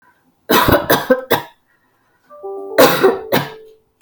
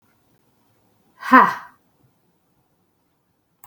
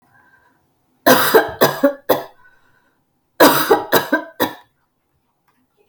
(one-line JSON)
{"cough_length": "4.0 s", "cough_amplitude": 32768, "cough_signal_mean_std_ratio": 0.48, "exhalation_length": "3.7 s", "exhalation_amplitude": 32768, "exhalation_signal_mean_std_ratio": 0.2, "three_cough_length": "5.9 s", "three_cough_amplitude": 32768, "three_cough_signal_mean_std_ratio": 0.38, "survey_phase": "beta (2021-08-13 to 2022-03-07)", "age": "18-44", "gender": "Female", "wearing_mask": "No", "symptom_none": true, "smoker_status": "Never smoked", "respiratory_condition_asthma": false, "respiratory_condition_other": false, "recruitment_source": "REACT", "submission_delay": "15 days", "covid_test_result": "Negative", "covid_test_method": "RT-qPCR", "influenza_a_test_result": "Negative", "influenza_b_test_result": "Negative"}